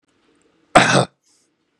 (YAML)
cough_length: 1.8 s
cough_amplitude: 32768
cough_signal_mean_std_ratio: 0.3
survey_phase: beta (2021-08-13 to 2022-03-07)
age: 18-44
gender: Male
wearing_mask: 'No'
symptom_none: true
smoker_status: Never smoked
respiratory_condition_asthma: false
respiratory_condition_other: false
recruitment_source: REACT
submission_delay: 1 day
covid_test_result: Negative
covid_test_method: RT-qPCR
influenza_a_test_result: Negative
influenza_b_test_result: Negative